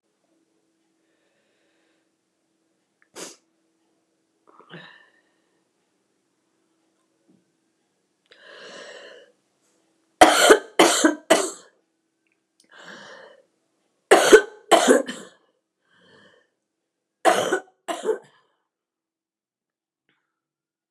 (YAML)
three_cough_length: 20.9 s
three_cough_amplitude: 29204
three_cough_signal_mean_std_ratio: 0.23
survey_phase: beta (2021-08-13 to 2022-03-07)
age: 65+
gender: Female
wearing_mask: 'No'
symptom_cough_any: true
symptom_runny_or_blocked_nose: true
symptom_sore_throat: true
symptom_fatigue: true
symptom_headache: true
symptom_change_to_sense_of_smell_or_taste: true
symptom_loss_of_taste: true
symptom_onset: 6 days
smoker_status: Never smoked
respiratory_condition_asthma: false
respiratory_condition_other: false
recruitment_source: Test and Trace
submission_delay: 2 days
covid_test_result: Positive
covid_test_method: RT-qPCR
covid_ct_value: 19.1
covid_ct_gene: ORF1ab gene